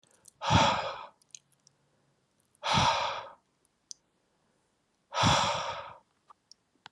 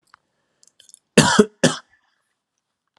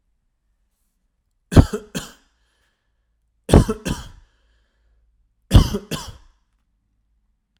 {"exhalation_length": "6.9 s", "exhalation_amplitude": 8308, "exhalation_signal_mean_std_ratio": 0.4, "cough_length": "3.0 s", "cough_amplitude": 32767, "cough_signal_mean_std_ratio": 0.25, "three_cough_length": "7.6 s", "three_cough_amplitude": 32768, "three_cough_signal_mean_std_ratio": 0.22, "survey_phase": "alpha (2021-03-01 to 2021-08-12)", "age": "18-44", "gender": "Male", "wearing_mask": "No", "symptom_none": true, "smoker_status": "Ex-smoker", "respiratory_condition_asthma": false, "respiratory_condition_other": false, "recruitment_source": "REACT", "submission_delay": "1 day", "covid_test_result": "Negative", "covid_test_method": "RT-qPCR"}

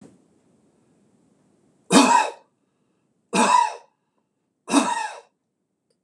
{"three_cough_length": "6.0 s", "three_cough_amplitude": 26028, "three_cough_signal_mean_std_ratio": 0.34, "survey_phase": "beta (2021-08-13 to 2022-03-07)", "age": "45-64", "gender": "Male", "wearing_mask": "No", "symptom_none": true, "smoker_status": "Never smoked", "respiratory_condition_asthma": false, "respiratory_condition_other": false, "recruitment_source": "REACT", "submission_delay": "3 days", "covid_test_result": "Negative", "covid_test_method": "RT-qPCR", "influenza_a_test_result": "Negative", "influenza_b_test_result": "Negative"}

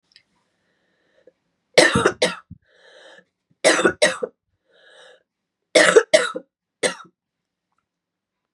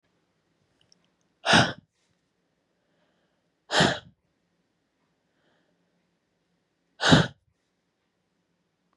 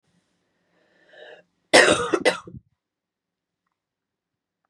{"three_cough_length": "8.5 s", "three_cough_amplitude": 32755, "three_cough_signal_mean_std_ratio": 0.3, "exhalation_length": "9.0 s", "exhalation_amplitude": 19956, "exhalation_signal_mean_std_ratio": 0.22, "cough_length": "4.7 s", "cough_amplitude": 31233, "cough_signal_mean_std_ratio": 0.25, "survey_phase": "beta (2021-08-13 to 2022-03-07)", "age": "45-64", "gender": "Female", "wearing_mask": "No", "symptom_cough_any": true, "symptom_runny_or_blocked_nose": true, "symptom_sore_throat": true, "symptom_fatigue": true, "symptom_headache": true, "symptom_other": true, "symptom_onset": "4 days", "smoker_status": "Never smoked", "respiratory_condition_asthma": false, "respiratory_condition_other": false, "recruitment_source": "Test and Trace", "submission_delay": "3 days", "covid_test_result": "Negative", "covid_test_method": "RT-qPCR"}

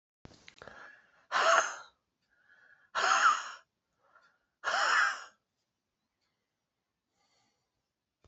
{"exhalation_length": "8.3 s", "exhalation_amplitude": 11737, "exhalation_signal_mean_std_ratio": 0.34, "survey_phase": "beta (2021-08-13 to 2022-03-07)", "age": "45-64", "gender": "Male", "wearing_mask": "No", "symptom_change_to_sense_of_smell_or_taste": true, "symptom_loss_of_taste": true, "smoker_status": "Never smoked", "respiratory_condition_asthma": false, "respiratory_condition_other": false, "recruitment_source": "Test and Trace", "submission_delay": "2 days", "covid_test_result": "Positive", "covid_test_method": "RT-qPCR", "covid_ct_value": 13.0, "covid_ct_gene": "ORF1ab gene", "covid_ct_mean": 13.2, "covid_viral_load": "48000000 copies/ml", "covid_viral_load_category": "High viral load (>1M copies/ml)"}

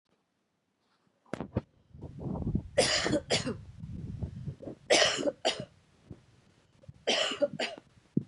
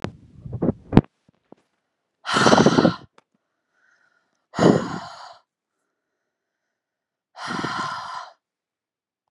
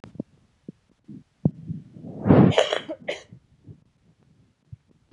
{"three_cough_length": "8.3 s", "three_cough_amplitude": 10067, "three_cough_signal_mean_std_ratio": 0.47, "exhalation_length": "9.3 s", "exhalation_amplitude": 32768, "exhalation_signal_mean_std_ratio": 0.3, "cough_length": "5.1 s", "cough_amplitude": 24628, "cough_signal_mean_std_ratio": 0.29, "survey_phase": "beta (2021-08-13 to 2022-03-07)", "age": "18-44", "gender": "Female", "wearing_mask": "No", "symptom_cough_any": true, "symptom_new_continuous_cough": true, "symptom_runny_or_blocked_nose": true, "symptom_fatigue": true, "symptom_headache": true, "symptom_change_to_sense_of_smell_or_taste": true, "symptom_loss_of_taste": true, "symptom_onset": "7 days", "smoker_status": "Never smoked", "respiratory_condition_asthma": false, "respiratory_condition_other": false, "recruitment_source": "Test and Trace", "submission_delay": "2 days", "covid_test_result": "Positive", "covid_test_method": "ePCR"}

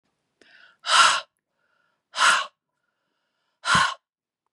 {"exhalation_length": "4.5 s", "exhalation_amplitude": 21367, "exhalation_signal_mean_std_ratio": 0.35, "survey_phase": "beta (2021-08-13 to 2022-03-07)", "age": "65+", "gender": "Female", "wearing_mask": "No", "symptom_none": true, "smoker_status": "Ex-smoker", "respiratory_condition_asthma": false, "respiratory_condition_other": false, "recruitment_source": "REACT", "submission_delay": "1 day", "covid_test_result": "Negative", "covid_test_method": "RT-qPCR"}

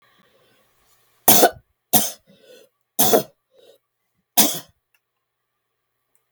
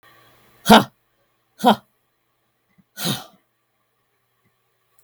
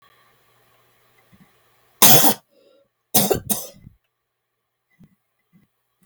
{"three_cough_length": "6.3 s", "three_cough_amplitude": 32768, "three_cough_signal_mean_std_ratio": 0.27, "exhalation_length": "5.0 s", "exhalation_amplitude": 32768, "exhalation_signal_mean_std_ratio": 0.21, "cough_length": "6.1 s", "cough_amplitude": 32768, "cough_signal_mean_std_ratio": 0.25, "survey_phase": "beta (2021-08-13 to 2022-03-07)", "age": "65+", "gender": "Female", "wearing_mask": "No", "symptom_none": true, "smoker_status": "Ex-smoker", "respiratory_condition_asthma": false, "respiratory_condition_other": false, "recruitment_source": "REACT", "submission_delay": "2 days", "covid_test_result": "Negative", "covid_test_method": "RT-qPCR", "influenza_a_test_result": "Negative", "influenza_b_test_result": "Negative"}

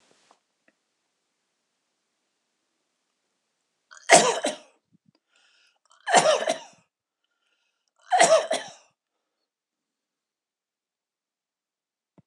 {"three_cough_length": "12.3 s", "three_cough_amplitude": 26028, "three_cough_signal_mean_std_ratio": 0.23, "survey_phase": "beta (2021-08-13 to 2022-03-07)", "age": "45-64", "gender": "Male", "wearing_mask": "No", "symptom_none": true, "smoker_status": "Never smoked", "respiratory_condition_asthma": false, "respiratory_condition_other": true, "recruitment_source": "REACT", "submission_delay": "2 days", "covid_test_result": "Negative", "covid_test_method": "RT-qPCR", "influenza_a_test_result": "Negative", "influenza_b_test_result": "Negative"}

